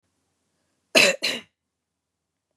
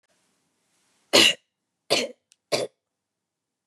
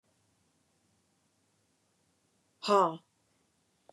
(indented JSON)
{
  "cough_length": "2.6 s",
  "cough_amplitude": 24724,
  "cough_signal_mean_std_ratio": 0.26,
  "three_cough_length": "3.7 s",
  "three_cough_amplitude": 26367,
  "three_cough_signal_mean_std_ratio": 0.26,
  "exhalation_length": "3.9 s",
  "exhalation_amplitude": 7667,
  "exhalation_signal_mean_std_ratio": 0.2,
  "survey_phase": "beta (2021-08-13 to 2022-03-07)",
  "age": "45-64",
  "gender": "Female",
  "wearing_mask": "No",
  "symptom_runny_or_blocked_nose": true,
  "symptom_headache": true,
  "smoker_status": "Never smoked",
  "respiratory_condition_asthma": true,
  "respiratory_condition_other": false,
  "recruitment_source": "REACT",
  "submission_delay": "1 day",
  "covid_test_result": "Negative",
  "covid_test_method": "RT-qPCR",
  "influenza_a_test_result": "Negative",
  "influenza_b_test_result": "Negative"
}